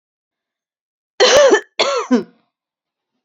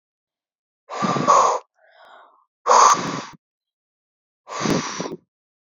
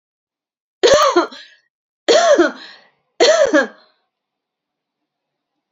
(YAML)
cough_length: 3.2 s
cough_amplitude: 30262
cough_signal_mean_std_ratio: 0.4
exhalation_length: 5.7 s
exhalation_amplitude: 30477
exhalation_signal_mean_std_ratio: 0.4
three_cough_length: 5.7 s
three_cough_amplitude: 32544
three_cough_signal_mean_std_ratio: 0.41
survey_phase: beta (2021-08-13 to 2022-03-07)
age: 18-44
gender: Female
wearing_mask: 'No'
symptom_none: true
smoker_status: Never smoked
respiratory_condition_asthma: false
respiratory_condition_other: false
recruitment_source: REACT
submission_delay: 1 day
covid_test_result: Negative
covid_test_method: RT-qPCR